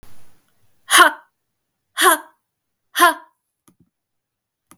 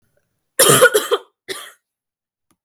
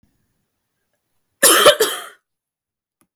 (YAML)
exhalation_length: 4.8 s
exhalation_amplitude: 32768
exhalation_signal_mean_std_ratio: 0.28
three_cough_length: 2.6 s
three_cough_amplitude: 32768
three_cough_signal_mean_std_ratio: 0.35
cough_length: 3.2 s
cough_amplitude: 32768
cough_signal_mean_std_ratio: 0.3
survey_phase: beta (2021-08-13 to 2022-03-07)
age: 18-44
gender: Female
wearing_mask: 'No'
symptom_cough_any: true
symptom_sore_throat: true
smoker_status: Never smoked
respiratory_condition_asthma: false
respiratory_condition_other: false
recruitment_source: Test and Trace
submission_delay: 1 day
covid_test_result: Negative
covid_test_method: RT-qPCR